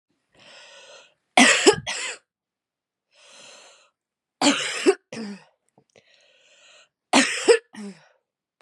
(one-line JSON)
{"three_cough_length": "8.6 s", "three_cough_amplitude": 30825, "three_cough_signal_mean_std_ratio": 0.31, "survey_phase": "beta (2021-08-13 to 2022-03-07)", "age": "18-44", "gender": "Female", "wearing_mask": "No", "symptom_runny_or_blocked_nose": true, "symptom_sore_throat": true, "symptom_abdominal_pain": true, "symptom_fatigue": true, "symptom_fever_high_temperature": true, "symptom_headache": true, "smoker_status": "Ex-smoker", "respiratory_condition_asthma": true, "respiratory_condition_other": false, "recruitment_source": "Test and Trace", "submission_delay": "1 day", "covid_test_result": "Positive", "covid_test_method": "RT-qPCR", "covid_ct_value": 25.4, "covid_ct_gene": "ORF1ab gene", "covid_ct_mean": 26.0, "covid_viral_load": "3000 copies/ml", "covid_viral_load_category": "Minimal viral load (< 10K copies/ml)"}